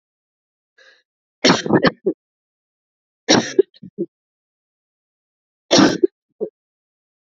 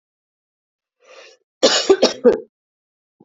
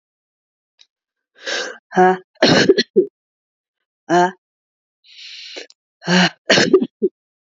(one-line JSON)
{"three_cough_length": "7.3 s", "three_cough_amplitude": 32768, "three_cough_signal_mean_std_ratio": 0.28, "cough_length": "3.2 s", "cough_amplitude": 32618, "cough_signal_mean_std_ratio": 0.31, "exhalation_length": "7.6 s", "exhalation_amplitude": 32767, "exhalation_signal_mean_std_ratio": 0.38, "survey_phase": "beta (2021-08-13 to 2022-03-07)", "age": "18-44", "gender": "Female", "wearing_mask": "No", "symptom_cough_any": true, "symptom_runny_or_blocked_nose": true, "symptom_fatigue": true, "symptom_change_to_sense_of_smell_or_taste": true, "symptom_onset": "10 days", "smoker_status": "Never smoked", "respiratory_condition_asthma": true, "respiratory_condition_other": false, "recruitment_source": "Test and Trace", "submission_delay": "2 days", "covid_test_result": "Positive", "covid_test_method": "RT-qPCR", "covid_ct_value": 19.4, "covid_ct_gene": "N gene", "covid_ct_mean": 20.0, "covid_viral_load": "270000 copies/ml", "covid_viral_load_category": "Low viral load (10K-1M copies/ml)"}